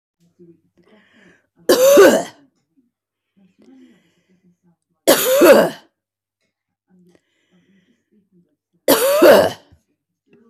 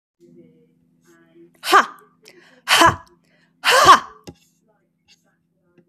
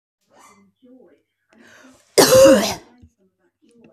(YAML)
three_cough_length: 10.5 s
three_cough_amplitude: 32767
three_cough_signal_mean_std_ratio: 0.34
exhalation_length: 5.9 s
exhalation_amplitude: 31953
exhalation_signal_mean_std_ratio: 0.29
cough_length: 3.9 s
cough_amplitude: 32220
cough_signal_mean_std_ratio: 0.31
survey_phase: beta (2021-08-13 to 2022-03-07)
age: 45-64
gender: Female
wearing_mask: 'No'
symptom_none: true
smoker_status: Ex-smoker
respiratory_condition_asthma: false
respiratory_condition_other: false
recruitment_source: REACT
submission_delay: 3 days
covid_test_result: Negative
covid_test_method: RT-qPCR
influenza_a_test_result: Negative
influenza_b_test_result: Negative